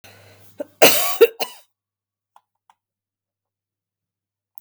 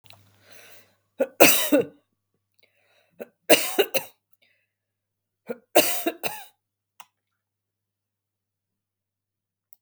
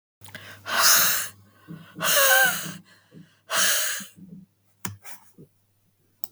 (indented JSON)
{
  "cough_length": "4.6 s",
  "cough_amplitude": 32768,
  "cough_signal_mean_std_ratio": 0.23,
  "three_cough_length": "9.8 s",
  "three_cough_amplitude": 32768,
  "three_cough_signal_mean_std_ratio": 0.25,
  "exhalation_length": "6.3 s",
  "exhalation_amplitude": 22814,
  "exhalation_signal_mean_std_ratio": 0.46,
  "survey_phase": "beta (2021-08-13 to 2022-03-07)",
  "age": "65+",
  "gender": "Female",
  "wearing_mask": "No",
  "symptom_diarrhoea": true,
  "symptom_fatigue": true,
  "smoker_status": "Ex-smoker",
  "respiratory_condition_asthma": false,
  "respiratory_condition_other": false,
  "recruitment_source": "Test and Trace",
  "submission_delay": "1 day",
  "covid_test_result": "Positive",
  "covid_test_method": "RT-qPCR",
  "covid_ct_value": 32.2,
  "covid_ct_gene": "ORF1ab gene"
}